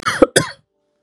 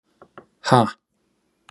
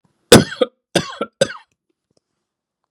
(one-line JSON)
{"cough_length": "1.0 s", "cough_amplitude": 32768, "cough_signal_mean_std_ratio": 0.35, "exhalation_length": "1.7 s", "exhalation_amplitude": 30765, "exhalation_signal_mean_std_ratio": 0.26, "three_cough_length": "2.9 s", "three_cough_amplitude": 32768, "three_cough_signal_mean_std_ratio": 0.24, "survey_phase": "beta (2021-08-13 to 2022-03-07)", "age": "45-64", "gender": "Male", "wearing_mask": "No", "symptom_none": true, "symptom_onset": "9 days", "smoker_status": "Never smoked", "respiratory_condition_asthma": false, "respiratory_condition_other": false, "recruitment_source": "REACT", "submission_delay": "5 days", "covid_test_result": "Negative", "covid_test_method": "RT-qPCR", "influenza_a_test_result": "Negative", "influenza_b_test_result": "Negative"}